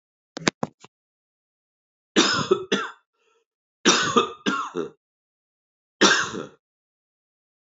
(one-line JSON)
{"three_cough_length": "7.7 s", "three_cough_amplitude": 31963, "three_cough_signal_mean_std_ratio": 0.35, "survey_phase": "beta (2021-08-13 to 2022-03-07)", "age": "45-64", "gender": "Male", "wearing_mask": "No", "symptom_cough_any": true, "symptom_runny_or_blocked_nose": true, "symptom_sore_throat": true, "symptom_headache": true, "symptom_other": true, "symptom_onset": "3 days", "smoker_status": "Never smoked", "respiratory_condition_asthma": false, "respiratory_condition_other": false, "recruitment_source": "Test and Trace", "submission_delay": "1 day", "covid_test_result": "Positive", "covid_test_method": "RT-qPCR", "covid_ct_value": 21.7, "covid_ct_gene": "N gene"}